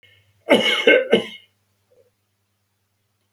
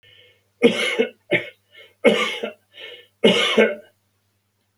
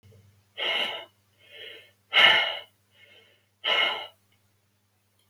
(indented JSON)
{
  "cough_length": "3.3 s",
  "cough_amplitude": 32404,
  "cough_signal_mean_std_ratio": 0.34,
  "three_cough_length": "4.8 s",
  "three_cough_amplitude": 27989,
  "three_cough_signal_mean_std_ratio": 0.42,
  "exhalation_length": "5.3 s",
  "exhalation_amplitude": 21639,
  "exhalation_signal_mean_std_ratio": 0.36,
  "survey_phase": "beta (2021-08-13 to 2022-03-07)",
  "age": "65+",
  "gender": "Male",
  "wearing_mask": "No",
  "symptom_none": true,
  "smoker_status": "Never smoked",
  "respiratory_condition_asthma": false,
  "respiratory_condition_other": false,
  "recruitment_source": "REACT",
  "submission_delay": "2 days",
  "covid_test_result": "Negative",
  "covid_test_method": "RT-qPCR"
}